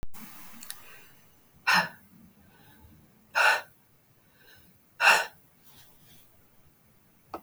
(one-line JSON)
{"exhalation_length": "7.4 s", "exhalation_amplitude": 17789, "exhalation_signal_mean_std_ratio": 0.31, "survey_phase": "beta (2021-08-13 to 2022-03-07)", "age": "45-64", "gender": "Female", "wearing_mask": "No", "symptom_cough_any": true, "symptom_onset": "7 days", "smoker_status": "Ex-smoker", "respiratory_condition_asthma": false, "respiratory_condition_other": false, "recruitment_source": "REACT", "submission_delay": "1 day", "covid_test_result": "Negative", "covid_test_method": "RT-qPCR", "influenza_a_test_result": "Negative", "influenza_b_test_result": "Negative"}